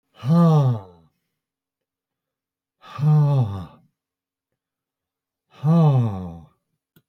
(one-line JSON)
{"exhalation_length": "7.1 s", "exhalation_amplitude": 12628, "exhalation_signal_mean_std_ratio": 0.47, "survey_phase": "beta (2021-08-13 to 2022-03-07)", "age": "65+", "gender": "Male", "wearing_mask": "No", "symptom_none": true, "smoker_status": "Ex-smoker", "respiratory_condition_asthma": false, "respiratory_condition_other": false, "recruitment_source": "REACT", "submission_delay": "1 day", "covid_test_result": "Negative", "covid_test_method": "RT-qPCR"}